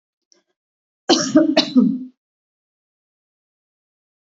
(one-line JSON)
{"cough_length": "4.4 s", "cough_amplitude": 29896, "cough_signal_mean_std_ratio": 0.32, "survey_phase": "beta (2021-08-13 to 2022-03-07)", "age": "65+", "gender": "Female", "wearing_mask": "No", "symptom_change_to_sense_of_smell_or_taste": true, "symptom_loss_of_taste": true, "smoker_status": "Never smoked", "respiratory_condition_asthma": false, "respiratory_condition_other": true, "recruitment_source": "REACT", "submission_delay": "2 days", "covid_test_result": "Negative", "covid_test_method": "RT-qPCR", "influenza_a_test_result": "Negative", "influenza_b_test_result": "Negative"}